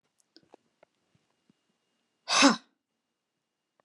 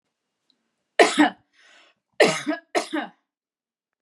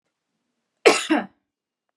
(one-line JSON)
{"exhalation_length": "3.8 s", "exhalation_amplitude": 15845, "exhalation_signal_mean_std_ratio": 0.2, "three_cough_length": "4.0 s", "three_cough_amplitude": 29381, "three_cough_signal_mean_std_ratio": 0.31, "cough_length": "2.0 s", "cough_amplitude": 28678, "cough_signal_mean_std_ratio": 0.28, "survey_phase": "beta (2021-08-13 to 2022-03-07)", "age": "45-64", "gender": "Female", "wearing_mask": "No", "symptom_none": true, "smoker_status": "Ex-smoker", "respiratory_condition_asthma": false, "respiratory_condition_other": false, "recruitment_source": "REACT", "submission_delay": "1 day", "covid_test_result": "Negative", "covid_test_method": "RT-qPCR"}